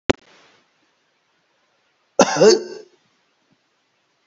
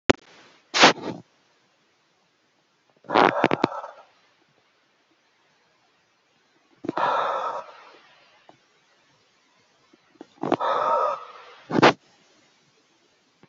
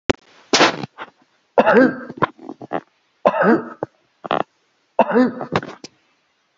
{"cough_length": "4.3 s", "cough_amplitude": 31262, "cough_signal_mean_std_ratio": 0.24, "exhalation_length": "13.5 s", "exhalation_amplitude": 29787, "exhalation_signal_mean_std_ratio": 0.29, "three_cough_length": "6.6 s", "three_cough_amplitude": 30750, "three_cough_signal_mean_std_ratio": 0.4, "survey_phase": "beta (2021-08-13 to 2022-03-07)", "age": "65+", "gender": "Male", "wearing_mask": "No", "symptom_none": true, "smoker_status": "Ex-smoker", "respiratory_condition_asthma": false, "respiratory_condition_other": false, "recruitment_source": "REACT", "submission_delay": "4 days", "covid_test_result": "Negative", "covid_test_method": "RT-qPCR"}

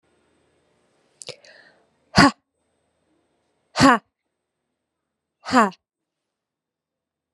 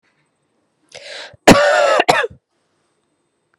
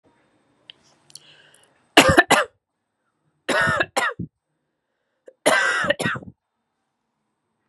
{"exhalation_length": "7.3 s", "exhalation_amplitude": 32166, "exhalation_signal_mean_std_ratio": 0.2, "cough_length": "3.6 s", "cough_amplitude": 32768, "cough_signal_mean_std_ratio": 0.36, "three_cough_length": "7.7 s", "three_cough_amplitude": 32768, "three_cough_signal_mean_std_ratio": 0.33, "survey_phase": "beta (2021-08-13 to 2022-03-07)", "age": "18-44", "gender": "Female", "wearing_mask": "No", "symptom_cough_any": true, "symptom_runny_or_blocked_nose": true, "symptom_shortness_of_breath": true, "symptom_sore_throat": true, "symptom_diarrhoea": true, "symptom_fatigue": true, "symptom_change_to_sense_of_smell_or_taste": true, "symptom_loss_of_taste": true, "symptom_onset": "2 days", "smoker_status": "Never smoked", "respiratory_condition_asthma": false, "respiratory_condition_other": false, "recruitment_source": "Test and Trace", "submission_delay": "2 days", "covid_test_result": "Positive", "covid_test_method": "ePCR"}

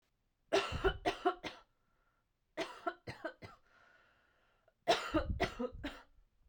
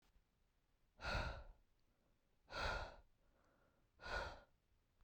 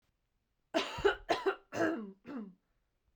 {"three_cough_length": "6.5 s", "three_cough_amplitude": 4695, "three_cough_signal_mean_std_ratio": 0.4, "exhalation_length": "5.0 s", "exhalation_amplitude": 871, "exhalation_signal_mean_std_ratio": 0.42, "cough_length": "3.2 s", "cough_amplitude": 5658, "cough_signal_mean_std_ratio": 0.44, "survey_phase": "beta (2021-08-13 to 2022-03-07)", "age": "18-44", "gender": "Female", "wearing_mask": "No", "symptom_none": true, "smoker_status": "Never smoked", "respiratory_condition_asthma": false, "respiratory_condition_other": false, "recruitment_source": "REACT", "submission_delay": "1 day", "covid_test_result": "Negative", "covid_test_method": "RT-qPCR"}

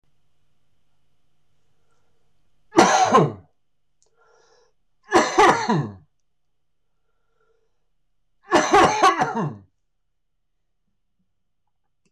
{"three_cough_length": "12.1 s", "three_cough_amplitude": 26028, "three_cough_signal_mean_std_ratio": 0.34, "survey_phase": "beta (2021-08-13 to 2022-03-07)", "age": "45-64", "gender": "Male", "wearing_mask": "No", "symptom_cough_any": true, "symptom_runny_or_blocked_nose": true, "symptom_sore_throat": true, "symptom_fatigue": true, "symptom_fever_high_temperature": true, "symptom_headache": true, "symptom_onset": "3 days", "smoker_status": "Never smoked", "respiratory_condition_asthma": false, "respiratory_condition_other": false, "recruitment_source": "Test and Trace", "submission_delay": "2 days", "covid_test_result": "Positive", "covid_test_method": "RT-qPCR", "covid_ct_value": 19.5, "covid_ct_gene": "ORF1ab gene", "covid_ct_mean": 20.6, "covid_viral_load": "170000 copies/ml", "covid_viral_load_category": "Low viral load (10K-1M copies/ml)"}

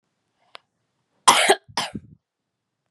{"cough_length": "2.9 s", "cough_amplitude": 32767, "cough_signal_mean_std_ratio": 0.26, "survey_phase": "beta (2021-08-13 to 2022-03-07)", "age": "18-44", "gender": "Female", "wearing_mask": "No", "symptom_runny_or_blocked_nose": true, "smoker_status": "Never smoked", "respiratory_condition_asthma": false, "respiratory_condition_other": false, "recruitment_source": "REACT", "submission_delay": "2 days", "covid_test_result": "Negative", "covid_test_method": "RT-qPCR", "influenza_a_test_result": "Negative", "influenza_b_test_result": "Negative"}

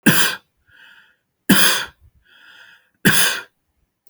{"three_cough_length": "4.1 s", "three_cough_amplitude": 32768, "three_cough_signal_mean_std_ratio": 0.39, "survey_phase": "alpha (2021-03-01 to 2021-08-12)", "age": "45-64", "gender": "Male", "wearing_mask": "No", "symptom_none": true, "smoker_status": "Never smoked", "respiratory_condition_asthma": true, "respiratory_condition_other": false, "recruitment_source": "REACT", "submission_delay": "4 days", "covid_test_result": "Negative", "covid_test_method": "RT-qPCR"}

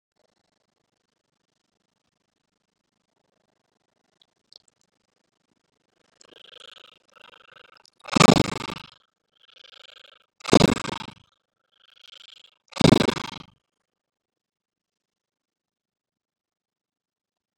{"exhalation_length": "17.6 s", "exhalation_amplitude": 32395, "exhalation_signal_mean_std_ratio": 0.15, "survey_phase": "beta (2021-08-13 to 2022-03-07)", "age": "65+", "gender": "Male", "wearing_mask": "No", "symptom_runny_or_blocked_nose": true, "smoker_status": "Ex-smoker", "respiratory_condition_asthma": false, "respiratory_condition_other": false, "recruitment_source": "REACT", "submission_delay": "2 days", "covid_test_result": "Negative", "covid_test_method": "RT-qPCR", "influenza_a_test_result": "Negative", "influenza_b_test_result": "Negative"}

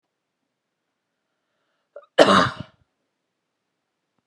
{"cough_length": "4.3 s", "cough_amplitude": 32768, "cough_signal_mean_std_ratio": 0.2, "survey_phase": "beta (2021-08-13 to 2022-03-07)", "age": "45-64", "gender": "Female", "wearing_mask": "No", "symptom_none": true, "smoker_status": "Ex-smoker", "respiratory_condition_asthma": false, "respiratory_condition_other": false, "recruitment_source": "REACT", "submission_delay": "1 day", "covid_test_result": "Negative", "covid_test_method": "RT-qPCR", "influenza_a_test_result": "Negative", "influenza_b_test_result": "Negative"}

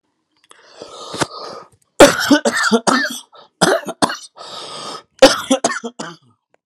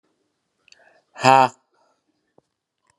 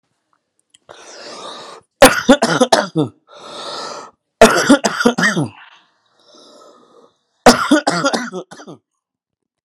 {"cough_length": "6.7 s", "cough_amplitude": 32768, "cough_signal_mean_std_ratio": 0.4, "exhalation_length": "3.0 s", "exhalation_amplitude": 30845, "exhalation_signal_mean_std_ratio": 0.2, "three_cough_length": "9.6 s", "three_cough_amplitude": 32768, "three_cough_signal_mean_std_ratio": 0.38, "survey_phase": "beta (2021-08-13 to 2022-03-07)", "age": "18-44", "gender": "Male", "wearing_mask": "No", "symptom_prefer_not_to_say": true, "smoker_status": "Current smoker (11 or more cigarettes per day)", "respiratory_condition_asthma": true, "respiratory_condition_other": true, "recruitment_source": "Test and Trace", "submission_delay": "2 days", "covid_test_result": "Negative", "covid_test_method": "RT-qPCR"}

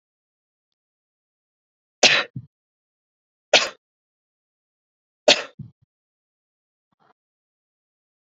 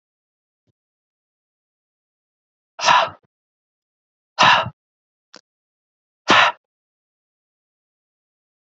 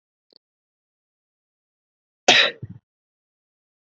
{"three_cough_length": "8.3 s", "three_cough_amplitude": 30045, "three_cough_signal_mean_std_ratio": 0.17, "exhalation_length": "8.8 s", "exhalation_amplitude": 29999, "exhalation_signal_mean_std_ratio": 0.23, "cough_length": "3.8 s", "cough_amplitude": 31240, "cough_signal_mean_std_ratio": 0.19, "survey_phase": "beta (2021-08-13 to 2022-03-07)", "age": "18-44", "gender": "Male", "wearing_mask": "No", "symptom_none": true, "smoker_status": "Never smoked", "respiratory_condition_asthma": false, "respiratory_condition_other": false, "recruitment_source": "REACT", "submission_delay": "2 days", "covid_test_result": "Negative", "covid_test_method": "RT-qPCR", "influenza_a_test_result": "Negative", "influenza_b_test_result": "Negative"}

